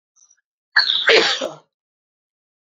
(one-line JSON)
{"cough_length": "2.6 s", "cough_amplitude": 28630, "cough_signal_mean_std_ratio": 0.38, "survey_phase": "beta (2021-08-13 to 2022-03-07)", "age": "18-44", "gender": "Female", "wearing_mask": "No", "symptom_cough_any": true, "symptom_runny_or_blocked_nose": true, "symptom_sore_throat": true, "symptom_abdominal_pain": true, "symptom_diarrhoea": true, "symptom_headache": true, "symptom_onset": "4 days", "smoker_status": "Never smoked", "respiratory_condition_asthma": false, "respiratory_condition_other": false, "recruitment_source": "Test and Trace", "submission_delay": "1 day", "covid_test_result": "Positive", "covid_test_method": "RT-qPCR", "covid_ct_value": 31.2, "covid_ct_gene": "ORF1ab gene"}